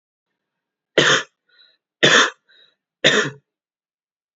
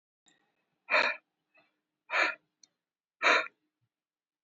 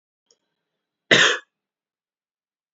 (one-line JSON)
{"three_cough_length": "4.4 s", "three_cough_amplitude": 32768, "three_cough_signal_mean_std_ratio": 0.33, "exhalation_length": "4.4 s", "exhalation_amplitude": 9614, "exhalation_signal_mean_std_ratio": 0.3, "cough_length": "2.7 s", "cough_amplitude": 28243, "cough_signal_mean_std_ratio": 0.24, "survey_phase": "beta (2021-08-13 to 2022-03-07)", "age": "18-44", "gender": "Male", "wearing_mask": "No", "symptom_none": true, "smoker_status": "Never smoked", "respiratory_condition_asthma": false, "respiratory_condition_other": false, "recruitment_source": "REACT", "submission_delay": "1 day", "covid_test_result": "Negative", "covid_test_method": "RT-qPCR", "influenza_a_test_result": "Negative", "influenza_b_test_result": "Negative"}